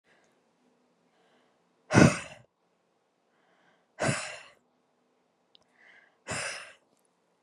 {
  "exhalation_length": "7.4 s",
  "exhalation_amplitude": 24153,
  "exhalation_signal_mean_std_ratio": 0.21,
  "survey_phase": "beta (2021-08-13 to 2022-03-07)",
  "age": "18-44",
  "gender": "Female",
  "wearing_mask": "No",
  "symptom_none": true,
  "smoker_status": "Never smoked",
  "respiratory_condition_asthma": false,
  "respiratory_condition_other": false,
  "recruitment_source": "REACT",
  "submission_delay": "2 days",
  "covid_test_result": "Negative",
  "covid_test_method": "RT-qPCR"
}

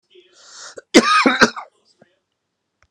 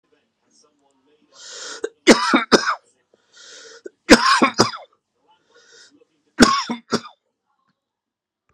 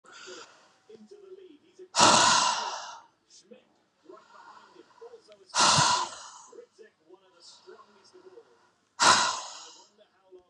{
  "cough_length": "2.9 s",
  "cough_amplitude": 32768,
  "cough_signal_mean_std_ratio": 0.33,
  "three_cough_length": "8.5 s",
  "three_cough_amplitude": 32768,
  "three_cough_signal_mean_std_ratio": 0.3,
  "exhalation_length": "10.5 s",
  "exhalation_amplitude": 16701,
  "exhalation_signal_mean_std_ratio": 0.36,
  "survey_phase": "beta (2021-08-13 to 2022-03-07)",
  "age": "45-64",
  "gender": "Male",
  "wearing_mask": "No",
  "symptom_headache": true,
  "symptom_onset": "2 days",
  "smoker_status": "Ex-smoker",
  "respiratory_condition_asthma": false,
  "respiratory_condition_other": false,
  "recruitment_source": "Test and Trace",
  "submission_delay": "1 day",
  "covid_test_result": "Positive",
  "covid_test_method": "RT-qPCR",
  "covid_ct_value": 31.2,
  "covid_ct_gene": "ORF1ab gene",
  "covid_ct_mean": 31.2,
  "covid_viral_load": "57 copies/ml",
  "covid_viral_load_category": "Minimal viral load (< 10K copies/ml)"
}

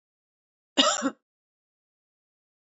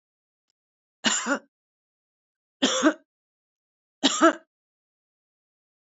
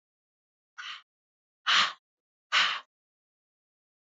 {
  "cough_length": "2.7 s",
  "cough_amplitude": 16104,
  "cough_signal_mean_std_ratio": 0.24,
  "three_cough_length": "6.0 s",
  "three_cough_amplitude": 20323,
  "three_cough_signal_mean_std_ratio": 0.27,
  "exhalation_length": "4.0 s",
  "exhalation_amplitude": 9780,
  "exhalation_signal_mean_std_ratio": 0.29,
  "survey_phase": "beta (2021-08-13 to 2022-03-07)",
  "age": "45-64",
  "gender": "Female",
  "wearing_mask": "No",
  "symptom_none": true,
  "smoker_status": "Ex-smoker",
  "respiratory_condition_asthma": false,
  "respiratory_condition_other": false,
  "recruitment_source": "REACT",
  "submission_delay": "1 day",
  "covid_test_result": "Negative",
  "covid_test_method": "RT-qPCR"
}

